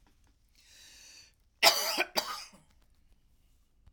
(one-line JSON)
{"cough_length": "3.9 s", "cough_amplitude": 16889, "cough_signal_mean_std_ratio": 0.28, "survey_phase": "alpha (2021-03-01 to 2021-08-12)", "age": "65+", "gender": "Female", "wearing_mask": "No", "symptom_none": true, "smoker_status": "Never smoked", "respiratory_condition_asthma": false, "respiratory_condition_other": false, "recruitment_source": "REACT", "submission_delay": "2 days", "covid_test_result": "Negative", "covid_test_method": "RT-qPCR"}